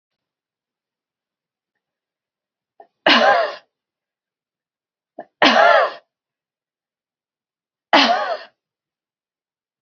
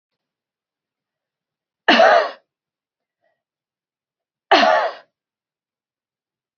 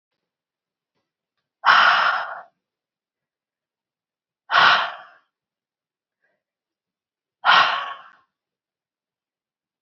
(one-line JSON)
{"three_cough_length": "9.8 s", "three_cough_amplitude": 31786, "three_cough_signal_mean_std_ratio": 0.29, "cough_length": "6.6 s", "cough_amplitude": 30006, "cough_signal_mean_std_ratio": 0.28, "exhalation_length": "9.8 s", "exhalation_amplitude": 27343, "exhalation_signal_mean_std_ratio": 0.3, "survey_phase": "alpha (2021-03-01 to 2021-08-12)", "age": "45-64", "gender": "Female", "wearing_mask": "No", "symptom_none": true, "smoker_status": "Ex-smoker", "respiratory_condition_asthma": false, "respiratory_condition_other": false, "recruitment_source": "REACT", "submission_delay": "1 day", "covid_test_result": "Negative", "covid_test_method": "RT-qPCR"}